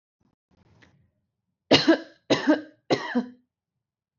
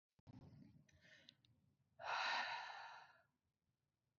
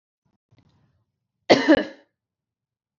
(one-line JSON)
{"three_cough_length": "4.2 s", "three_cough_amplitude": 22280, "three_cough_signal_mean_std_ratio": 0.32, "exhalation_length": "4.2 s", "exhalation_amplitude": 841, "exhalation_signal_mean_std_ratio": 0.42, "cough_length": "3.0 s", "cough_amplitude": 27507, "cough_signal_mean_std_ratio": 0.23, "survey_phase": "beta (2021-08-13 to 2022-03-07)", "age": "18-44", "gender": "Female", "wearing_mask": "No", "symptom_sore_throat": true, "symptom_onset": "6 days", "smoker_status": "Never smoked", "respiratory_condition_asthma": false, "respiratory_condition_other": false, "recruitment_source": "REACT", "submission_delay": "0 days", "covid_test_result": "Negative", "covid_test_method": "RT-qPCR"}